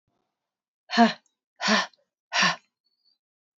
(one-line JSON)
{"exhalation_length": "3.6 s", "exhalation_amplitude": 18813, "exhalation_signal_mean_std_ratio": 0.32, "survey_phase": "beta (2021-08-13 to 2022-03-07)", "age": "18-44", "gender": "Female", "wearing_mask": "No", "symptom_cough_any": true, "symptom_runny_or_blocked_nose": true, "symptom_sore_throat": true, "symptom_fatigue": true, "symptom_headache": true, "symptom_other": true, "symptom_onset": "4 days", "smoker_status": "Never smoked", "respiratory_condition_asthma": false, "respiratory_condition_other": false, "recruitment_source": "Test and Trace", "submission_delay": "2 days", "covid_test_result": "Positive", "covid_test_method": "RT-qPCR", "covid_ct_value": 35.0, "covid_ct_gene": "ORF1ab gene"}